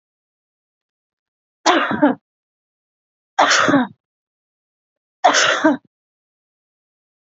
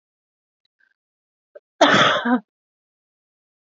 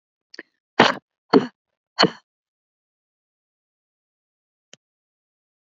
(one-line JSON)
{"three_cough_length": "7.3 s", "three_cough_amplitude": 30510, "three_cough_signal_mean_std_ratio": 0.35, "cough_length": "3.8 s", "cough_amplitude": 29164, "cough_signal_mean_std_ratio": 0.3, "exhalation_length": "5.6 s", "exhalation_amplitude": 27761, "exhalation_signal_mean_std_ratio": 0.18, "survey_phase": "beta (2021-08-13 to 2022-03-07)", "age": "45-64", "gender": "Female", "wearing_mask": "No", "symptom_fatigue": true, "symptom_onset": "12 days", "smoker_status": "Never smoked", "respiratory_condition_asthma": true, "respiratory_condition_other": false, "recruitment_source": "REACT", "submission_delay": "0 days", "covid_test_result": "Negative", "covid_test_method": "RT-qPCR"}